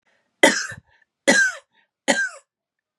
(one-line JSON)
{"three_cough_length": "3.0 s", "three_cough_amplitude": 32767, "three_cough_signal_mean_std_ratio": 0.37, "survey_phase": "beta (2021-08-13 to 2022-03-07)", "age": "45-64", "gender": "Female", "wearing_mask": "No", "symptom_cough_any": true, "symptom_runny_or_blocked_nose": true, "symptom_change_to_sense_of_smell_or_taste": true, "symptom_loss_of_taste": true, "symptom_onset": "9 days", "smoker_status": "Ex-smoker", "respiratory_condition_asthma": false, "respiratory_condition_other": false, "recruitment_source": "Test and Trace", "submission_delay": "2 days", "covid_test_result": "Positive", "covid_test_method": "RT-qPCR", "covid_ct_value": 18.8, "covid_ct_gene": "ORF1ab gene"}